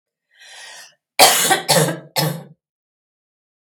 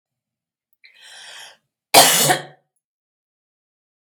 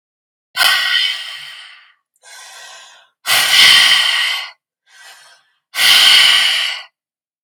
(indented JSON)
{
  "three_cough_length": "3.6 s",
  "three_cough_amplitude": 32768,
  "three_cough_signal_mean_std_ratio": 0.39,
  "cough_length": "4.2 s",
  "cough_amplitude": 32768,
  "cough_signal_mean_std_ratio": 0.26,
  "exhalation_length": "7.4 s",
  "exhalation_amplitude": 32768,
  "exhalation_signal_mean_std_ratio": 0.53,
  "survey_phase": "beta (2021-08-13 to 2022-03-07)",
  "age": "45-64",
  "gender": "Female",
  "wearing_mask": "No",
  "symptom_runny_or_blocked_nose": true,
  "smoker_status": "Never smoked",
  "respiratory_condition_asthma": false,
  "respiratory_condition_other": false,
  "recruitment_source": "REACT",
  "submission_delay": "3 days",
  "covid_test_result": "Negative",
  "covid_test_method": "RT-qPCR",
  "influenza_a_test_result": "Negative",
  "influenza_b_test_result": "Negative"
}